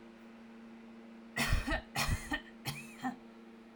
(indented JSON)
{
  "three_cough_length": "3.8 s",
  "three_cough_amplitude": 3921,
  "three_cough_signal_mean_std_ratio": 0.56,
  "survey_phase": "alpha (2021-03-01 to 2021-08-12)",
  "age": "18-44",
  "gender": "Female",
  "wearing_mask": "No",
  "symptom_cough_any": true,
  "symptom_headache": true,
  "smoker_status": "Never smoked",
  "respiratory_condition_asthma": false,
  "respiratory_condition_other": false,
  "recruitment_source": "Test and Trace",
  "submission_delay": "2 days",
  "covid_test_result": "Positive",
  "covid_test_method": "RT-qPCR",
  "covid_ct_value": 12.9,
  "covid_ct_gene": "ORF1ab gene",
  "covid_ct_mean": 13.5,
  "covid_viral_load": "37000000 copies/ml",
  "covid_viral_load_category": "High viral load (>1M copies/ml)"
}